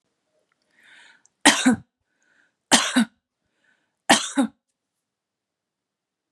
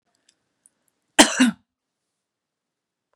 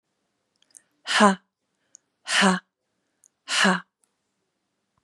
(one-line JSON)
{"three_cough_length": "6.3 s", "three_cough_amplitude": 32767, "three_cough_signal_mean_std_ratio": 0.27, "cough_length": "3.2 s", "cough_amplitude": 32768, "cough_signal_mean_std_ratio": 0.21, "exhalation_length": "5.0 s", "exhalation_amplitude": 27536, "exhalation_signal_mean_std_ratio": 0.31, "survey_phase": "beta (2021-08-13 to 2022-03-07)", "age": "45-64", "gender": "Female", "wearing_mask": "No", "symptom_none": true, "smoker_status": "Ex-smoker", "respiratory_condition_asthma": true, "respiratory_condition_other": false, "recruitment_source": "REACT", "submission_delay": "1 day", "covid_test_result": "Negative", "covid_test_method": "RT-qPCR", "influenza_a_test_result": "Unknown/Void", "influenza_b_test_result": "Unknown/Void"}